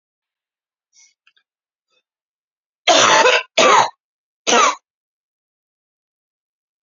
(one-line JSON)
{"three_cough_length": "6.8 s", "three_cough_amplitude": 32767, "three_cough_signal_mean_std_ratio": 0.33, "survey_phase": "beta (2021-08-13 to 2022-03-07)", "age": "18-44", "gender": "Female", "wearing_mask": "No", "symptom_cough_any": true, "symptom_runny_or_blocked_nose": true, "symptom_fatigue": true, "symptom_headache": true, "symptom_other": true, "symptom_onset": "5 days", "smoker_status": "Never smoked", "respiratory_condition_asthma": false, "respiratory_condition_other": false, "recruitment_source": "Test and Trace", "submission_delay": "2 days", "covid_test_result": "Positive", "covid_test_method": "RT-qPCR", "covid_ct_value": 17.6, "covid_ct_gene": "ORF1ab gene", "covid_ct_mean": 17.8, "covid_viral_load": "1400000 copies/ml", "covid_viral_load_category": "High viral load (>1M copies/ml)"}